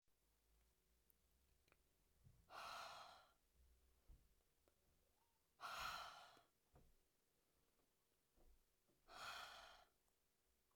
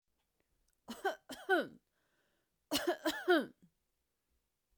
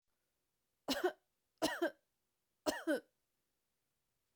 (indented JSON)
{
  "exhalation_length": "10.8 s",
  "exhalation_amplitude": 347,
  "exhalation_signal_mean_std_ratio": 0.43,
  "cough_length": "4.8 s",
  "cough_amplitude": 3983,
  "cough_signal_mean_std_ratio": 0.33,
  "three_cough_length": "4.4 s",
  "three_cough_amplitude": 2909,
  "three_cough_signal_mean_std_ratio": 0.31,
  "survey_phase": "beta (2021-08-13 to 2022-03-07)",
  "age": "45-64",
  "gender": "Female",
  "wearing_mask": "No",
  "symptom_none": true,
  "smoker_status": "Never smoked",
  "respiratory_condition_asthma": false,
  "respiratory_condition_other": false,
  "recruitment_source": "REACT",
  "submission_delay": "1 day",
  "covid_test_result": "Negative",
  "covid_test_method": "RT-qPCR",
  "influenza_a_test_result": "Negative",
  "influenza_b_test_result": "Negative"
}